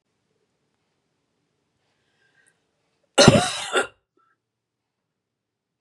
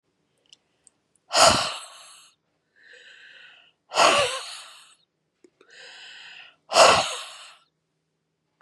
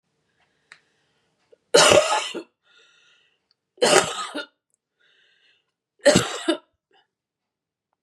cough_length: 5.8 s
cough_amplitude: 32768
cough_signal_mean_std_ratio: 0.21
exhalation_length: 8.6 s
exhalation_amplitude: 27138
exhalation_signal_mean_std_ratio: 0.31
three_cough_length: 8.0 s
three_cough_amplitude: 32768
three_cough_signal_mean_std_ratio: 0.3
survey_phase: beta (2021-08-13 to 2022-03-07)
age: 45-64
gender: Female
wearing_mask: 'No'
symptom_cough_any: true
symptom_onset: 5 days
smoker_status: Ex-smoker
respiratory_condition_asthma: true
respiratory_condition_other: false
recruitment_source: REACT
submission_delay: 1 day
covid_test_result: Negative
covid_test_method: RT-qPCR
influenza_a_test_result: Negative
influenza_b_test_result: Negative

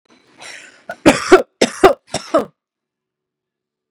cough_length: 3.9 s
cough_amplitude: 32768
cough_signal_mean_std_ratio: 0.29
survey_phase: beta (2021-08-13 to 2022-03-07)
age: 18-44
gender: Female
wearing_mask: 'No'
symptom_none: true
smoker_status: Ex-smoker
respiratory_condition_asthma: false
respiratory_condition_other: false
recruitment_source: REACT
submission_delay: 3 days
covid_test_result: Negative
covid_test_method: RT-qPCR
influenza_a_test_result: Negative
influenza_b_test_result: Negative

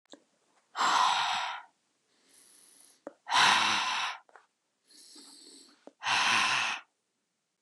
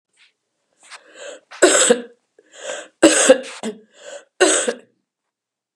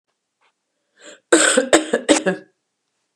exhalation_length: 7.6 s
exhalation_amplitude: 9533
exhalation_signal_mean_std_ratio: 0.48
three_cough_length: 5.8 s
three_cough_amplitude: 32768
three_cough_signal_mean_std_ratio: 0.36
cough_length: 3.2 s
cough_amplitude: 32767
cough_signal_mean_std_ratio: 0.37
survey_phase: beta (2021-08-13 to 2022-03-07)
age: 65+
gender: Female
wearing_mask: 'No'
symptom_fatigue: true
symptom_headache: true
symptom_onset: 3 days
smoker_status: Never smoked
respiratory_condition_asthma: false
respiratory_condition_other: false
recruitment_source: Test and Trace
submission_delay: 1 day
covid_test_result: Positive
covid_test_method: ePCR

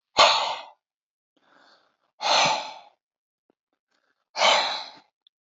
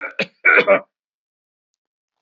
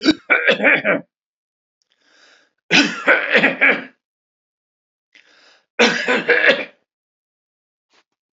exhalation_length: 5.5 s
exhalation_amplitude: 25631
exhalation_signal_mean_std_ratio: 0.36
cough_length: 2.2 s
cough_amplitude: 28457
cough_signal_mean_std_ratio: 0.33
three_cough_length: 8.4 s
three_cough_amplitude: 31593
three_cough_signal_mean_std_ratio: 0.42
survey_phase: alpha (2021-03-01 to 2021-08-12)
age: 45-64
gender: Male
wearing_mask: 'No'
symptom_none: true
smoker_status: Ex-smoker
respiratory_condition_asthma: false
respiratory_condition_other: false
recruitment_source: REACT
submission_delay: 1 day
covid_test_result: Negative
covid_test_method: RT-qPCR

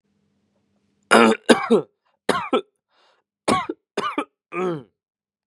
three_cough_length: 5.5 s
three_cough_amplitude: 32684
three_cough_signal_mean_std_ratio: 0.36
survey_phase: beta (2021-08-13 to 2022-03-07)
age: 18-44
gender: Male
wearing_mask: 'No'
symptom_none: true
symptom_onset: 8 days
smoker_status: Never smoked
respiratory_condition_asthma: false
respiratory_condition_other: false
recruitment_source: REACT
submission_delay: 0 days
covid_test_result: Negative
covid_test_method: RT-qPCR
covid_ct_value: 38.0
covid_ct_gene: N gene
influenza_a_test_result: Negative
influenza_b_test_result: Negative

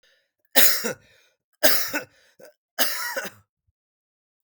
three_cough_length: 4.4 s
three_cough_amplitude: 32768
three_cough_signal_mean_std_ratio: 0.35
survey_phase: beta (2021-08-13 to 2022-03-07)
age: 45-64
gender: Male
wearing_mask: 'No'
symptom_none: true
smoker_status: Never smoked
respiratory_condition_asthma: false
respiratory_condition_other: false
recruitment_source: REACT
submission_delay: 2 days
covid_test_result: Negative
covid_test_method: RT-qPCR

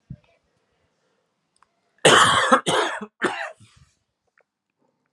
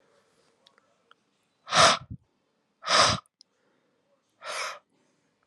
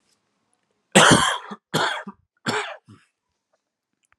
cough_length: 5.1 s
cough_amplitude: 32646
cough_signal_mean_std_ratio: 0.34
exhalation_length: 5.5 s
exhalation_amplitude: 17048
exhalation_signal_mean_std_ratio: 0.28
three_cough_length: 4.2 s
three_cough_amplitude: 32767
three_cough_signal_mean_std_ratio: 0.33
survey_phase: alpha (2021-03-01 to 2021-08-12)
age: 18-44
gender: Male
wearing_mask: 'No'
symptom_new_continuous_cough: true
symptom_shortness_of_breath: true
symptom_fatigue: true
symptom_headache: true
symptom_onset: 3 days
smoker_status: Ex-smoker
respiratory_condition_asthma: false
respiratory_condition_other: false
recruitment_source: Test and Trace
submission_delay: 2 days
covid_test_result: Positive
covid_test_method: ePCR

